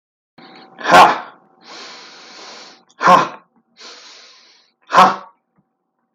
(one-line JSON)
{"exhalation_length": "6.1 s", "exhalation_amplitude": 32768, "exhalation_signal_mean_std_ratio": 0.31, "survey_phase": "alpha (2021-03-01 to 2021-08-12)", "age": "45-64", "gender": "Male", "wearing_mask": "No", "symptom_none": true, "smoker_status": "Never smoked", "respiratory_condition_asthma": false, "respiratory_condition_other": false, "recruitment_source": "REACT", "submission_delay": "1 day", "covid_test_result": "Negative", "covid_test_method": "RT-qPCR"}